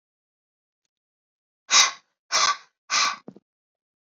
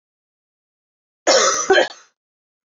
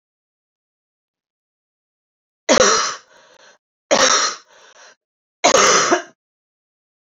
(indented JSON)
{
  "exhalation_length": "4.2 s",
  "exhalation_amplitude": 23505,
  "exhalation_signal_mean_std_ratio": 0.3,
  "cough_length": "2.7 s",
  "cough_amplitude": 26928,
  "cough_signal_mean_std_ratio": 0.37,
  "three_cough_length": "7.2 s",
  "three_cough_amplitude": 30131,
  "three_cough_signal_mean_std_ratio": 0.36,
  "survey_phase": "alpha (2021-03-01 to 2021-08-12)",
  "age": "18-44",
  "gender": "Female",
  "wearing_mask": "No",
  "symptom_cough_any": true,
  "smoker_status": "Never smoked",
  "respiratory_condition_asthma": false,
  "respiratory_condition_other": false,
  "recruitment_source": "Test and Trace",
  "submission_delay": "2 days",
  "covid_test_result": "Positive",
  "covid_test_method": "RT-qPCR",
  "covid_ct_value": 29.1,
  "covid_ct_gene": "N gene"
}